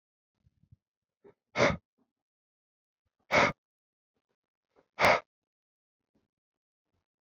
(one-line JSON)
{"exhalation_length": "7.3 s", "exhalation_amplitude": 9824, "exhalation_signal_mean_std_ratio": 0.22, "survey_phase": "beta (2021-08-13 to 2022-03-07)", "age": "18-44", "gender": "Male", "wearing_mask": "No", "symptom_cough_any": true, "symptom_runny_or_blocked_nose": true, "symptom_sore_throat": true, "smoker_status": "Never smoked", "respiratory_condition_asthma": false, "respiratory_condition_other": false, "recruitment_source": "Test and Trace", "submission_delay": "1 day", "covid_test_result": "Positive", "covid_test_method": "RT-qPCR", "covid_ct_value": 23.2, "covid_ct_gene": "N gene"}